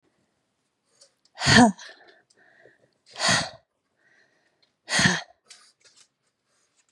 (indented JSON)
{
  "exhalation_length": "6.9 s",
  "exhalation_amplitude": 28489,
  "exhalation_signal_mean_std_ratio": 0.26,
  "survey_phase": "beta (2021-08-13 to 2022-03-07)",
  "age": "18-44",
  "gender": "Female",
  "wearing_mask": "No",
  "symptom_none": true,
  "smoker_status": "Never smoked",
  "respiratory_condition_asthma": false,
  "respiratory_condition_other": false,
  "recruitment_source": "REACT",
  "submission_delay": "1 day",
  "covid_test_result": "Negative",
  "covid_test_method": "RT-qPCR",
  "influenza_a_test_result": "Negative",
  "influenza_b_test_result": "Negative"
}